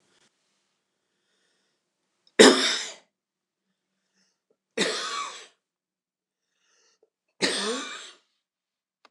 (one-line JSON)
{"three_cough_length": "9.1 s", "three_cough_amplitude": 29041, "three_cough_signal_mean_std_ratio": 0.23, "survey_phase": "beta (2021-08-13 to 2022-03-07)", "age": "65+", "gender": "Male", "wearing_mask": "No", "symptom_fatigue": true, "smoker_status": "Never smoked", "respiratory_condition_asthma": false, "respiratory_condition_other": false, "recruitment_source": "REACT", "submission_delay": "3 days", "covid_test_result": "Negative", "covid_test_method": "RT-qPCR", "influenza_a_test_result": "Unknown/Void", "influenza_b_test_result": "Unknown/Void"}